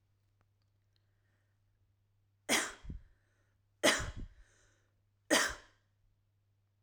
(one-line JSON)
{"three_cough_length": "6.8 s", "three_cough_amplitude": 6948, "three_cough_signal_mean_std_ratio": 0.27, "survey_phase": "alpha (2021-03-01 to 2021-08-12)", "age": "18-44", "gender": "Female", "wearing_mask": "No", "symptom_none": true, "smoker_status": "Never smoked", "respiratory_condition_asthma": false, "respiratory_condition_other": false, "recruitment_source": "REACT", "submission_delay": "2 days", "covid_test_result": "Negative", "covid_test_method": "RT-qPCR"}